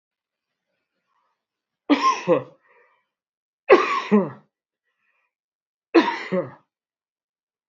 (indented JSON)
{
  "three_cough_length": "7.7 s",
  "three_cough_amplitude": 30685,
  "three_cough_signal_mean_std_ratio": 0.3,
  "survey_phase": "beta (2021-08-13 to 2022-03-07)",
  "age": "65+",
  "gender": "Male",
  "wearing_mask": "No",
  "symptom_none": true,
  "smoker_status": "Never smoked",
  "respiratory_condition_asthma": false,
  "respiratory_condition_other": false,
  "recruitment_source": "REACT",
  "submission_delay": "2 days",
  "covid_test_result": "Negative",
  "covid_test_method": "RT-qPCR"
}